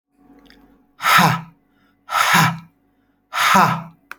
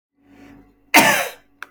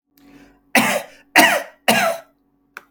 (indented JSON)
{
  "exhalation_length": "4.2 s",
  "exhalation_amplitude": 31664,
  "exhalation_signal_mean_std_ratio": 0.46,
  "cough_length": "1.7 s",
  "cough_amplitude": 32592,
  "cough_signal_mean_std_ratio": 0.35,
  "three_cough_length": "2.9 s",
  "three_cough_amplitude": 32241,
  "three_cough_signal_mean_std_ratio": 0.43,
  "survey_phase": "beta (2021-08-13 to 2022-03-07)",
  "age": "65+",
  "gender": "Male",
  "wearing_mask": "No",
  "symptom_none": true,
  "smoker_status": "Ex-smoker",
  "respiratory_condition_asthma": false,
  "respiratory_condition_other": false,
  "recruitment_source": "REACT",
  "submission_delay": "0 days",
  "covid_test_result": "Negative",
  "covid_test_method": "RT-qPCR"
}